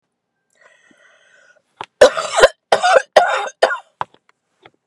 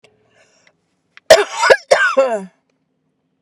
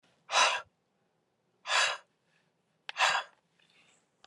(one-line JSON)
{"three_cough_length": "4.9 s", "three_cough_amplitude": 32768, "three_cough_signal_mean_std_ratio": 0.33, "cough_length": "3.4 s", "cough_amplitude": 32768, "cough_signal_mean_std_ratio": 0.37, "exhalation_length": "4.3 s", "exhalation_amplitude": 8205, "exhalation_signal_mean_std_ratio": 0.35, "survey_phase": "beta (2021-08-13 to 2022-03-07)", "age": "45-64", "gender": "Female", "wearing_mask": "No", "symptom_none": true, "smoker_status": "Never smoked", "respiratory_condition_asthma": false, "respiratory_condition_other": false, "recruitment_source": "REACT", "submission_delay": "1 day", "covid_test_result": "Negative", "covid_test_method": "RT-qPCR"}